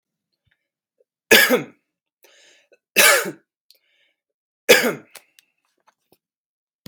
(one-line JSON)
{"three_cough_length": "6.9 s", "three_cough_amplitude": 32768, "three_cough_signal_mean_std_ratio": 0.27, "survey_phase": "beta (2021-08-13 to 2022-03-07)", "age": "18-44", "gender": "Male", "wearing_mask": "No", "symptom_none": true, "symptom_onset": "2 days", "smoker_status": "Ex-smoker", "respiratory_condition_asthma": false, "respiratory_condition_other": false, "recruitment_source": "Test and Trace", "submission_delay": "1 day", "covid_test_result": "Negative", "covid_test_method": "RT-qPCR"}